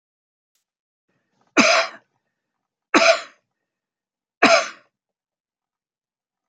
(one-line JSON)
{"three_cough_length": "6.5 s", "three_cough_amplitude": 29036, "three_cough_signal_mean_std_ratio": 0.27, "survey_phase": "alpha (2021-03-01 to 2021-08-12)", "age": "65+", "gender": "Male", "wearing_mask": "No", "symptom_none": true, "smoker_status": "Never smoked", "respiratory_condition_asthma": false, "respiratory_condition_other": false, "recruitment_source": "REACT", "submission_delay": "3 days", "covid_test_result": "Negative", "covid_test_method": "RT-qPCR"}